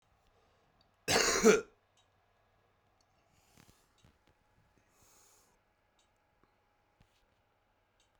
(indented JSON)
{
  "cough_length": "8.2 s",
  "cough_amplitude": 8198,
  "cough_signal_mean_std_ratio": 0.2,
  "survey_phase": "beta (2021-08-13 to 2022-03-07)",
  "age": "45-64",
  "gender": "Male",
  "wearing_mask": "No",
  "symptom_shortness_of_breath": true,
  "smoker_status": "Current smoker (1 to 10 cigarettes per day)",
  "respiratory_condition_asthma": true,
  "respiratory_condition_other": true,
  "recruitment_source": "REACT",
  "submission_delay": "2 days",
  "covid_test_result": "Negative",
  "covid_test_method": "RT-qPCR"
}